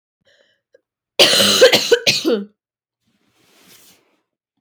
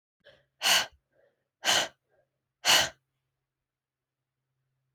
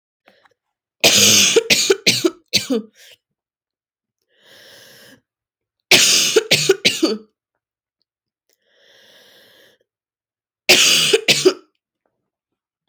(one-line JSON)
{"cough_length": "4.6 s", "cough_amplitude": 32767, "cough_signal_mean_std_ratio": 0.38, "exhalation_length": "4.9 s", "exhalation_amplitude": 11646, "exhalation_signal_mean_std_ratio": 0.29, "three_cough_length": "12.9 s", "three_cough_amplitude": 32768, "three_cough_signal_mean_std_ratio": 0.38, "survey_phase": "alpha (2021-03-01 to 2021-08-12)", "age": "18-44", "gender": "Female", "wearing_mask": "No", "symptom_cough_any": true, "symptom_new_continuous_cough": true, "symptom_fatigue": true, "symptom_fever_high_temperature": true, "symptom_headache": true, "smoker_status": "Never smoked", "respiratory_condition_asthma": false, "respiratory_condition_other": false, "recruitment_source": "Test and Trace", "submission_delay": "1 day", "covid_test_result": "Positive", "covid_test_method": "RT-qPCR"}